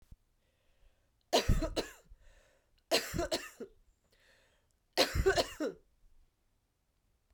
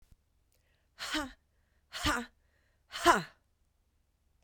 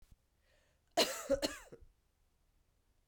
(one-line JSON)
{"three_cough_length": "7.3 s", "three_cough_amplitude": 7079, "three_cough_signal_mean_std_ratio": 0.35, "exhalation_length": "4.4 s", "exhalation_amplitude": 10882, "exhalation_signal_mean_std_ratio": 0.28, "cough_length": "3.1 s", "cough_amplitude": 4728, "cough_signal_mean_std_ratio": 0.29, "survey_phase": "beta (2021-08-13 to 2022-03-07)", "age": "45-64", "gender": "Female", "wearing_mask": "No", "symptom_runny_or_blocked_nose": true, "symptom_sore_throat": true, "symptom_fatigue": true, "symptom_change_to_sense_of_smell_or_taste": true, "symptom_onset": "4 days", "smoker_status": "Never smoked", "respiratory_condition_asthma": false, "respiratory_condition_other": false, "recruitment_source": "Test and Trace", "submission_delay": "2 days", "covid_test_result": "Positive", "covid_test_method": "RT-qPCR", "covid_ct_value": 24.2, "covid_ct_gene": "ORF1ab gene", "covid_ct_mean": 25.9, "covid_viral_load": "3200 copies/ml", "covid_viral_load_category": "Minimal viral load (< 10K copies/ml)"}